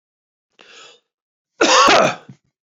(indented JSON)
{
  "cough_length": "2.7 s",
  "cough_amplitude": 31138,
  "cough_signal_mean_std_ratio": 0.37,
  "survey_phase": "beta (2021-08-13 to 2022-03-07)",
  "age": "65+",
  "gender": "Male",
  "wearing_mask": "No",
  "symptom_none": true,
  "smoker_status": "Never smoked",
  "respiratory_condition_asthma": false,
  "respiratory_condition_other": false,
  "recruitment_source": "REACT",
  "submission_delay": "2 days",
  "covid_test_result": "Negative",
  "covid_test_method": "RT-qPCR"
}